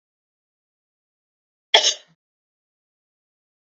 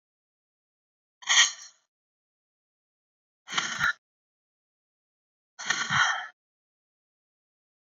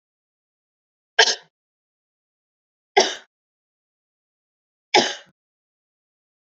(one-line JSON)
{"cough_length": "3.7 s", "cough_amplitude": 29192, "cough_signal_mean_std_ratio": 0.16, "exhalation_length": "7.9 s", "exhalation_amplitude": 17442, "exhalation_signal_mean_std_ratio": 0.28, "three_cough_length": "6.5 s", "three_cough_amplitude": 31762, "three_cough_signal_mean_std_ratio": 0.19, "survey_phase": "beta (2021-08-13 to 2022-03-07)", "age": "45-64", "gender": "Female", "wearing_mask": "No", "symptom_cough_any": true, "symptom_runny_or_blocked_nose": true, "symptom_sore_throat": true, "symptom_fatigue": true, "symptom_change_to_sense_of_smell_or_taste": true, "symptom_onset": "8 days", "smoker_status": "Never smoked", "respiratory_condition_asthma": false, "respiratory_condition_other": false, "recruitment_source": "REACT", "submission_delay": "2 days", "covid_test_result": "Negative", "covid_test_method": "RT-qPCR"}